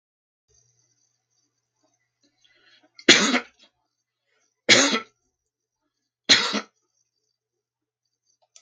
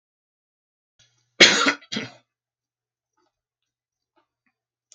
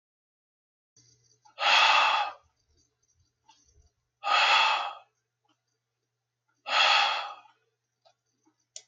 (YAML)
three_cough_length: 8.6 s
three_cough_amplitude: 32767
three_cough_signal_mean_std_ratio: 0.23
cough_length: 4.9 s
cough_amplitude: 32767
cough_signal_mean_std_ratio: 0.19
exhalation_length: 8.9 s
exhalation_amplitude: 11290
exhalation_signal_mean_std_ratio: 0.38
survey_phase: beta (2021-08-13 to 2022-03-07)
age: 65+
gender: Male
wearing_mask: 'No'
symptom_none: true
smoker_status: Ex-smoker
respiratory_condition_asthma: false
respiratory_condition_other: false
recruitment_source: REACT
submission_delay: 1 day
covid_test_result: Negative
covid_test_method: RT-qPCR
influenza_a_test_result: Negative
influenza_b_test_result: Negative